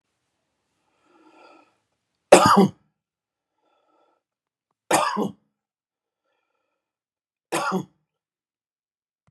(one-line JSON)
{"three_cough_length": "9.3 s", "three_cough_amplitude": 32768, "three_cough_signal_mean_std_ratio": 0.22, "survey_phase": "beta (2021-08-13 to 2022-03-07)", "age": "65+", "gender": "Male", "wearing_mask": "No", "symptom_none": true, "symptom_onset": "2 days", "smoker_status": "Never smoked", "respiratory_condition_asthma": false, "respiratory_condition_other": false, "recruitment_source": "REACT", "submission_delay": "1 day", "covid_test_result": "Negative", "covid_test_method": "RT-qPCR"}